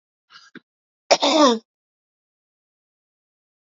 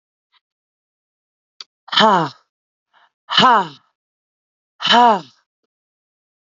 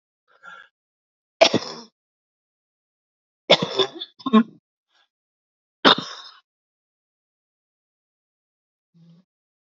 {
  "cough_length": "3.7 s",
  "cough_amplitude": 27702,
  "cough_signal_mean_std_ratio": 0.27,
  "exhalation_length": "6.6 s",
  "exhalation_amplitude": 30654,
  "exhalation_signal_mean_std_ratio": 0.31,
  "three_cough_length": "9.7 s",
  "three_cough_amplitude": 32767,
  "three_cough_signal_mean_std_ratio": 0.2,
  "survey_phase": "beta (2021-08-13 to 2022-03-07)",
  "age": "18-44",
  "gender": "Female",
  "wearing_mask": "No",
  "symptom_cough_any": true,
  "symptom_sore_throat": true,
  "symptom_abdominal_pain": true,
  "symptom_diarrhoea": true,
  "symptom_change_to_sense_of_smell_or_taste": true,
  "symptom_onset": "6 days",
  "smoker_status": "Current smoker (11 or more cigarettes per day)",
  "respiratory_condition_asthma": false,
  "respiratory_condition_other": false,
  "recruitment_source": "REACT",
  "submission_delay": "1 day",
  "covid_test_result": "Positive",
  "covid_test_method": "RT-qPCR",
  "covid_ct_value": 20.0,
  "covid_ct_gene": "E gene",
  "influenza_a_test_result": "Negative",
  "influenza_b_test_result": "Negative"
}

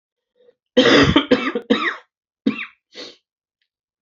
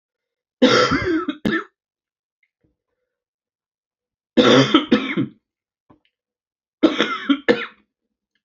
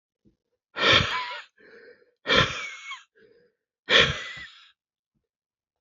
{
  "cough_length": "4.0 s",
  "cough_amplitude": 29339,
  "cough_signal_mean_std_ratio": 0.39,
  "three_cough_length": "8.4 s",
  "three_cough_amplitude": 32767,
  "three_cough_signal_mean_std_ratio": 0.38,
  "exhalation_length": "5.8 s",
  "exhalation_amplitude": 20426,
  "exhalation_signal_mean_std_ratio": 0.35,
  "survey_phase": "beta (2021-08-13 to 2022-03-07)",
  "age": "45-64",
  "gender": "Male",
  "wearing_mask": "No",
  "symptom_cough_any": true,
  "symptom_runny_or_blocked_nose": true,
  "symptom_sore_throat": true,
  "symptom_fatigue": true,
  "symptom_headache": true,
  "symptom_other": true,
  "symptom_onset": "5 days",
  "smoker_status": "Ex-smoker",
  "respiratory_condition_asthma": false,
  "respiratory_condition_other": false,
  "recruitment_source": "Test and Trace",
  "submission_delay": "2 days",
  "covid_test_result": "Positive",
  "covid_test_method": "RT-qPCR",
  "covid_ct_value": 19.7,
  "covid_ct_gene": "ORF1ab gene",
  "covid_ct_mean": 20.5,
  "covid_viral_load": "190000 copies/ml",
  "covid_viral_load_category": "Low viral load (10K-1M copies/ml)"
}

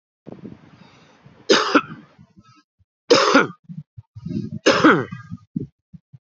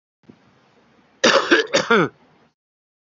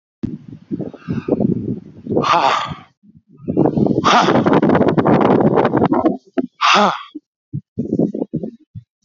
{
  "three_cough_length": "6.3 s",
  "three_cough_amplitude": 32347,
  "three_cough_signal_mean_std_ratio": 0.36,
  "cough_length": "3.2 s",
  "cough_amplitude": 31574,
  "cough_signal_mean_std_ratio": 0.36,
  "exhalation_length": "9.0 s",
  "exhalation_amplitude": 30109,
  "exhalation_signal_mean_std_ratio": 0.63,
  "survey_phase": "beta (2021-08-13 to 2022-03-07)",
  "age": "65+",
  "gender": "Male",
  "wearing_mask": "No",
  "symptom_cough_any": true,
  "smoker_status": "Current smoker (11 or more cigarettes per day)",
  "respiratory_condition_asthma": false,
  "respiratory_condition_other": true,
  "recruitment_source": "REACT",
  "submission_delay": "3 days",
  "covid_test_result": "Negative",
  "covid_test_method": "RT-qPCR"
}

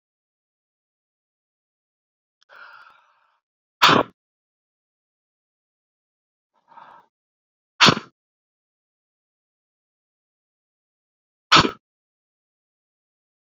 {
  "exhalation_length": "13.5 s",
  "exhalation_amplitude": 31213,
  "exhalation_signal_mean_std_ratio": 0.15,
  "survey_phase": "beta (2021-08-13 to 2022-03-07)",
  "age": "18-44",
  "gender": "Male",
  "wearing_mask": "No",
  "symptom_cough_any": true,
  "symptom_runny_or_blocked_nose": true,
  "symptom_sore_throat": true,
  "symptom_headache": true,
  "symptom_change_to_sense_of_smell_or_taste": true,
  "symptom_loss_of_taste": true,
  "symptom_onset": "4 days",
  "smoker_status": "Ex-smoker",
  "respiratory_condition_asthma": true,
  "respiratory_condition_other": false,
  "recruitment_source": "Test and Trace",
  "submission_delay": "1 day",
  "covid_test_result": "Positive",
  "covid_test_method": "RT-qPCR",
  "covid_ct_value": 19.7,
  "covid_ct_gene": "N gene",
  "covid_ct_mean": 20.3,
  "covid_viral_load": "210000 copies/ml",
  "covid_viral_load_category": "Low viral load (10K-1M copies/ml)"
}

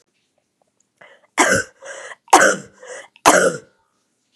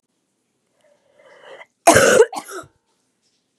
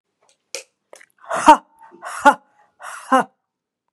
{
  "three_cough_length": "4.4 s",
  "three_cough_amplitude": 32768,
  "three_cough_signal_mean_std_ratio": 0.35,
  "cough_length": "3.6 s",
  "cough_amplitude": 32768,
  "cough_signal_mean_std_ratio": 0.29,
  "exhalation_length": "3.9 s",
  "exhalation_amplitude": 32768,
  "exhalation_signal_mean_std_ratio": 0.26,
  "survey_phase": "beta (2021-08-13 to 2022-03-07)",
  "age": "18-44",
  "gender": "Female",
  "wearing_mask": "No",
  "symptom_cough_any": true,
  "symptom_runny_or_blocked_nose": true,
  "symptom_shortness_of_breath": true,
  "symptom_headache": true,
  "symptom_change_to_sense_of_smell_or_taste": true,
  "symptom_onset": "3 days",
  "smoker_status": "Never smoked",
  "respiratory_condition_asthma": false,
  "respiratory_condition_other": false,
  "recruitment_source": "Test and Trace",
  "submission_delay": "2 days",
  "covid_test_result": "Positive",
  "covid_test_method": "RT-qPCR",
  "covid_ct_value": 21.1,
  "covid_ct_gene": "N gene"
}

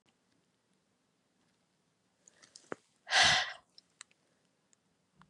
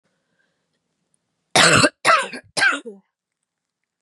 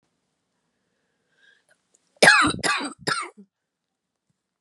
{
  "exhalation_length": "5.3 s",
  "exhalation_amplitude": 7091,
  "exhalation_signal_mean_std_ratio": 0.22,
  "three_cough_length": "4.0 s",
  "three_cough_amplitude": 31382,
  "three_cough_signal_mean_std_ratio": 0.35,
  "cough_length": "4.6 s",
  "cough_amplitude": 29637,
  "cough_signal_mean_std_ratio": 0.28,
  "survey_phase": "beta (2021-08-13 to 2022-03-07)",
  "age": "18-44",
  "gender": "Female",
  "wearing_mask": "No",
  "symptom_cough_any": true,
  "symptom_runny_or_blocked_nose": true,
  "symptom_shortness_of_breath": true,
  "symptom_sore_throat": true,
  "symptom_fatigue": true,
  "symptom_fever_high_temperature": true,
  "symptom_headache": true,
  "symptom_change_to_sense_of_smell_or_taste": true,
  "symptom_loss_of_taste": true,
  "symptom_onset": "2 days",
  "smoker_status": "Ex-smoker",
  "respiratory_condition_asthma": true,
  "respiratory_condition_other": false,
  "recruitment_source": "Test and Trace",
  "submission_delay": "2 days",
  "covid_test_result": "Positive",
  "covid_test_method": "RT-qPCR",
  "covid_ct_value": 26.7,
  "covid_ct_gene": "ORF1ab gene",
  "covid_ct_mean": 27.3,
  "covid_viral_load": "1100 copies/ml",
  "covid_viral_load_category": "Minimal viral load (< 10K copies/ml)"
}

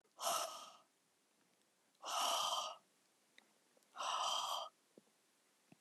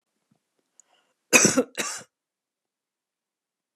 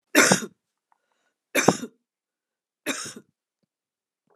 {
  "exhalation_length": "5.8 s",
  "exhalation_amplitude": 1604,
  "exhalation_signal_mean_std_ratio": 0.49,
  "cough_length": "3.8 s",
  "cough_amplitude": 29510,
  "cough_signal_mean_std_ratio": 0.23,
  "three_cough_length": "4.4 s",
  "three_cough_amplitude": 31985,
  "three_cough_signal_mean_std_ratio": 0.26,
  "survey_phase": "beta (2021-08-13 to 2022-03-07)",
  "age": "65+",
  "gender": "Female",
  "wearing_mask": "No",
  "symptom_none": true,
  "smoker_status": "Never smoked",
  "respiratory_condition_asthma": false,
  "respiratory_condition_other": false,
  "recruitment_source": "REACT",
  "submission_delay": "2 days",
  "covid_test_result": "Negative",
  "covid_test_method": "RT-qPCR",
  "influenza_a_test_result": "Negative",
  "influenza_b_test_result": "Negative"
}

